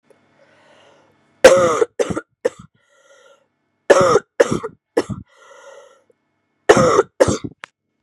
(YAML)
three_cough_length: 8.0 s
three_cough_amplitude: 32768
three_cough_signal_mean_std_ratio: 0.34
survey_phase: beta (2021-08-13 to 2022-03-07)
age: 18-44
gender: Female
wearing_mask: 'No'
symptom_cough_any: true
symptom_new_continuous_cough: true
symptom_runny_or_blocked_nose: true
symptom_sore_throat: true
symptom_fatigue: true
symptom_headache: true
symptom_onset: 4 days
smoker_status: Never smoked
respiratory_condition_asthma: false
respiratory_condition_other: false
recruitment_source: Test and Trace
submission_delay: 1 day
covid_test_result: Positive
covid_test_method: RT-qPCR
covid_ct_value: 19.6
covid_ct_gene: N gene